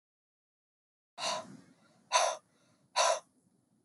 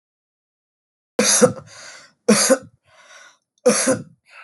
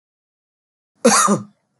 exhalation_length: 3.8 s
exhalation_amplitude: 7770
exhalation_signal_mean_std_ratio: 0.33
three_cough_length: 4.4 s
three_cough_amplitude: 32372
three_cough_signal_mean_std_ratio: 0.38
cough_length: 1.8 s
cough_amplitude: 29317
cough_signal_mean_std_ratio: 0.36
survey_phase: beta (2021-08-13 to 2022-03-07)
age: 18-44
gender: Male
wearing_mask: 'No'
symptom_none: true
smoker_status: Never smoked
respiratory_condition_asthma: false
respiratory_condition_other: false
recruitment_source: REACT
submission_delay: 1 day
covid_test_result: Negative
covid_test_method: RT-qPCR
influenza_a_test_result: Negative
influenza_b_test_result: Negative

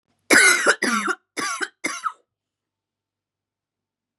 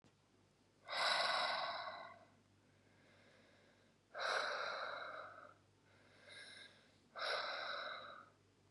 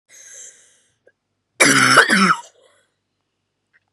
three_cough_length: 4.2 s
three_cough_amplitude: 29773
three_cough_signal_mean_std_ratio: 0.38
exhalation_length: 8.7 s
exhalation_amplitude: 2025
exhalation_signal_mean_std_ratio: 0.54
cough_length: 3.9 s
cough_amplitude: 32768
cough_signal_mean_std_ratio: 0.36
survey_phase: beta (2021-08-13 to 2022-03-07)
age: 18-44
gender: Female
wearing_mask: 'No'
symptom_cough_any: true
symptom_runny_or_blocked_nose: true
symptom_diarrhoea: true
symptom_headache: true
symptom_change_to_sense_of_smell_or_taste: true
symptom_onset: 5 days
smoker_status: Never smoked
respiratory_condition_asthma: false
respiratory_condition_other: false
recruitment_source: Test and Trace
submission_delay: 2 days
covid_test_result: Positive
covid_test_method: RT-qPCR
covid_ct_value: 15.4
covid_ct_gene: N gene
covid_ct_mean: 15.6
covid_viral_load: 7600000 copies/ml
covid_viral_load_category: High viral load (>1M copies/ml)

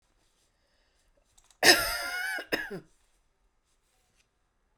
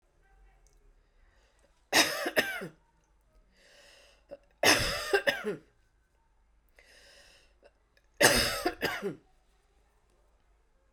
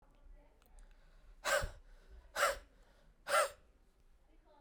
cough_length: 4.8 s
cough_amplitude: 19964
cough_signal_mean_std_ratio: 0.28
three_cough_length: 10.9 s
three_cough_amplitude: 15165
three_cough_signal_mean_std_ratio: 0.33
exhalation_length: 4.6 s
exhalation_amplitude: 3944
exhalation_signal_mean_std_ratio: 0.36
survey_phase: beta (2021-08-13 to 2022-03-07)
age: 45-64
gender: Female
wearing_mask: 'No'
symptom_none: true
smoker_status: Never smoked
respiratory_condition_asthma: false
respiratory_condition_other: false
recruitment_source: REACT
submission_delay: 4 days
covid_test_result: Negative
covid_test_method: RT-qPCR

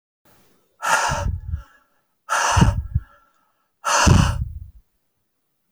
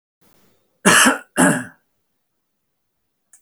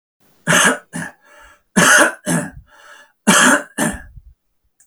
exhalation_length: 5.7 s
exhalation_amplitude: 29007
exhalation_signal_mean_std_ratio: 0.45
cough_length: 3.4 s
cough_amplitude: 32768
cough_signal_mean_std_ratio: 0.32
three_cough_length: 4.9 s
three_cough_amplitude: 32768
three_cough_signal_mean_std_ratio: 0.46
survey_phase: beta (2021-08-13 to 2022-03-07)
age: 65+
gender: Male
wearing_mask: 'No'
symptom_none: true
smoker_status: Ex-smoker
respiratory_condition_asthma: false
respiratory_condition_other: false
recruitment_source: REACT
submission_delay: 1 day
covid_test_result: Negative
covid_test_method: RT-qPCR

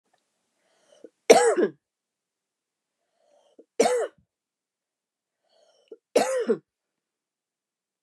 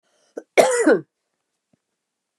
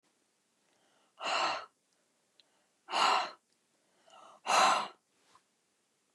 three_cough_length: 8.0 s
three_cough_amplitude: 29078
three_cough_signal_mean_std_ratio: 0.26
cough_length: 2.4 s
cough_amplitude: 29204
cough_signal_mean_std_ratio: 0.33
exhalation_length: 6.1 s
exhalation_amplitude: 7598
exhalation_signal_mean_std_ratio: 0.35
survey_phase: beta (2021-08-13 to 2022-03-07)
age: 45-64
gender: Female
wearing_mask: 'No'
symptom_none: true
symptom_onset: 9 days
smoker_status: Never smoked
respiratory_condition_asthma: false
respiratory_condition_other: false
recruitment_source: REACT
submission_delay: 1 day
covid_test_result: Negative
covid_test_method: RT-qPCR
influenza_a_test_result: Negative
influenza_b_test_result: Negative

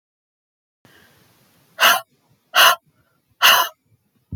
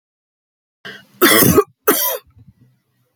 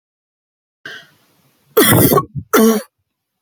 exhalation_length: 4.4 s
exhalation_amplitude: 30861
exhalation_signal_mean_std_ratio: 0.31
cough_length: 3.2 s
cough_amplitude: 32768
cough_signal_mean_std_ratio: 0.38
three_cough_length: 3.4 s
three_cough_amplitude: 32768
three_cough_signal_mean_std_ratio: 0.41
survey_phase: beta (2021-08-13 to 2022-03-07)
age: 45-64
gender: Female
wearing_mask: 'No'
symptom_none: true
smoker_status: Never smoked
respiratory_condition_asthma: false
respiratory_condition_other: false
recruitment_source: REACT
submission_delay: 2 days
covid_test_result: Negative
covid_test_method: RT-qPCR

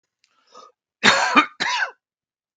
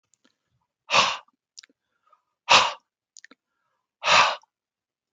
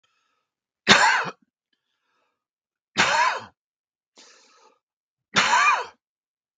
cough_length: 2.6 s
cough_amplitude: 32768
cough_signal_mean_std_ratio: 0.38
exhalation_length: 5.1 s
exhalation_amplitude: 27743
exhalation_signal_mean_std_ratio: 0.29
three_cough_length: 6.6 s
three_cough_amplitude: 32768
three_cough_signal_mean_std_ratio: 0.35
survey_phase: beta (2021-08-13 to 2022-03-07)
age: 45-64
gender: Male
wearing_mask: 'No'
symptom_cough_any: true
smoker_status: Never smoked
respiratory_condition_asthma: false
respiratory_condition_other: false
recruitment_source: REACT
submission_delay: 2 days
covid_test_result: Negative
covid_test_method: RT-qPCR
influenza_a_test_result: Negative
influenza_b_test_result: Negative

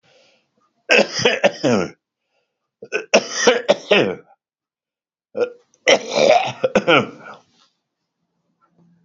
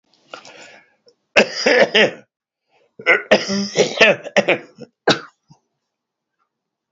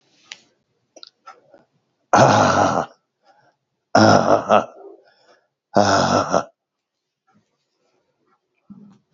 three_cough_length: 9.0 s
three_cough_amplitude: 32767
three_cough_signal_mean_std_ratio: 0.4
cough_length: 6.9 s
cough_amplitude: 32768
cough_signal_mean_std_ratio: 0.38
exhalation_length: 9.1 s
exhalation_amplitude: 32768
exhalation_signal_mean_std_ratio: 0.36
survey_phase: alpha (2021-03-01 to 2021-08-12)
age: 65+
gender: Male
wearing_mask: 'No'
symptom_none: true
smoker_status: Current smoker (1 to 10 cigarettes per day)
respiratory_condition_asthma: false
respiratory_condition_other: false
recruitment_source: REACT
submission_delay: 1 day
covid_test_result: Negative
covid_test_method: RT-qPCR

